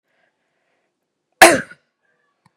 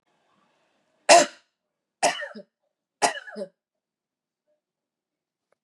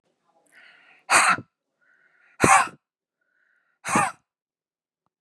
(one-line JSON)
{"cough_length": "2.6 s", "cough_amplitude": 32768, "cough_signal_mean_std_ratio": 0.19, "three_cough_length": "5.6 s", "three_cough_amplitude": 27287, "three_cough_signal_mean_std_ratio": 0.21, "exhalation_length": "5.2 s", "exhalation_amplitude": 31333, "exhalation_signal_mean_std_ratio": 0.29, "survey_phase": "beta (2021-08-13 to 2022-03-07)", "age": "45-64", "gender": "Female", "wearing_mask": "No", "symptom_none": true, "smoker_status": "Ex-smoker", "respiratory_condition_asthma": false, "respiratory_condition_other": false, "recruitment_source": "REACT", "submission_delay": "9 days", "covid_test_result": "Negative", "covid_test_method": "RT-qPCR"}